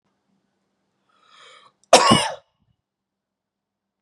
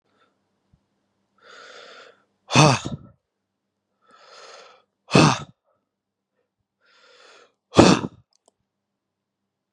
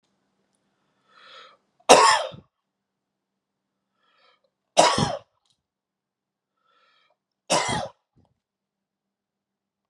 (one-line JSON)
{"cough_length": "4.0 s", "cough_amplitude": 32768, "cough_signal_mean_std_ratio": 0.22, "exhalation_length": "9.7 s", "exhalation_amplitude": 32768, "exhalation_signal_mean_std_ratio": 0.22, "three_cough_length": "9.9 s", "three_cough_amplitude": 32768, "three_cough_signal_mean_std_ratio": 0.23, "survey_phase": "beta (2021-08-13 to 2022-03-07)", "age": "18-44", "gender": "Male", "wearing_mask": "No", "symptom_none": true, "smoker_status": "Ex-smoker", "respiratory_condition_asthma": true, "respiratory_condition_other": false, "recruitment_source": "REACT", "submission_delay": "1 day", "covid_test_result": "Negative", "covid_test_method": "RT-qPCR", "influenza_a_test_result": "Negative", "influenza_b_test_result": "Negative"}